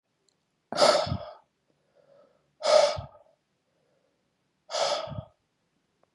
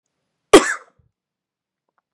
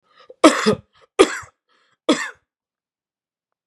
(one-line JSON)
{"exhalation_length": "6.1 s", "exhalation_amplitude": 16296, "exhalation_signal_mean_std_ratio": 0.33, "cough_length": "2.1 s", "cough_amplitude": 32768, "cough_signal_mean_std_ratio": 0.19, "three_cough_length": "3.7 s", "three_cough_amplitude": 32768, "three_cough_signal_mean_std_ratio": 0.27, "survey_phase": "beta (2021-08-13 to 2022-03-07)", "age": "45-64", "gender": "Male", "wearing_mask": "No", "symptom_runny_or_blocked_nose": true, "symptom_onset": "12 days", "smoker_status": "Never smoked", "respiratory_condition_asthma": false, "respiratory_condition_other": false, "recruitment_source": "REACT", "submission_delay": "2 days", "covid_test_result": "Positive", "covid_test_method": "RT-qPCR", "covid_ct_value": 32.7, "covid_ct_gene": "E gene", "influenza_a_test_result": "Negative", "influenza_b_test_result": "Negative"}